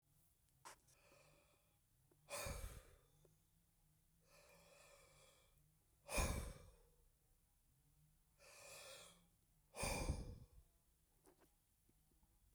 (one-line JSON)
{"exhalation_length": "12.5 s", "exhalation_amplitude": 1360, "exhalation_signal_mean_std_ratio": 0.35, "survey_phase": "beta (2021-08-13 to 2022-03-07)", "age": "65+", "gender": "Male", "wearing_mask": "No", "symptom_cough_any": true, "symptom_runny_or_blocked_nose": true, "smoker_status": "Never smoked", "respiratory_condition_asthma": false, "respiratory_condition_other": false, "recruitment_source": "Test and Trace", "submission_delay": "1 day", "covid_test_result": "Positive", "covid_test_method": "RT-qPCR", "covid_ct_value": 18.8, "covid_ct_gene": "ORF1ab gene"}